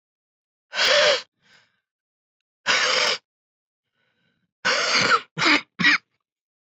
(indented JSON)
{
  "exhalation_length": "6.7 s",
  "exhalation_amplitude": 17078,
  "exhalation_signal_mean_std_ratio": 0.45,
  "survey_phase": "beta (2021-08-13 to 2022-03-07)",
  "age": "18-44",
  "gender": "Female",
  "wearing_mask": "Yes",
  "symptom_cough_any": true,
  "symptom_runny_or_blocked_nose": true,
  "symptom_sore_throat": true,
  "symptom_fatigue": true,
  "symptom_headache": true,
  "symptom_change_to_sense_of_smell_or_taste": true,
  "smoker_status": "Current smoker (11 or more cigarettes per day)",
  "respiratory_condition_asthma": true,
  "respiratory_condition_other": false,
  "recruitment_source": "Test and Trace",
  "submission_delay": "3 days",
  "covid_test_result": "Positive",
  "covid_test_method": "RT-qPCR",
  "covid_ct_value": 31.8,
  "covid_ct_gene": "ORF1ab gene",
  "covid_ct_mean": 32.8,
  "covid_viral_load": "17 copies/ml",
  "covid_viral_load_category": "Minimal viral load (< 10K copies/ml)"
}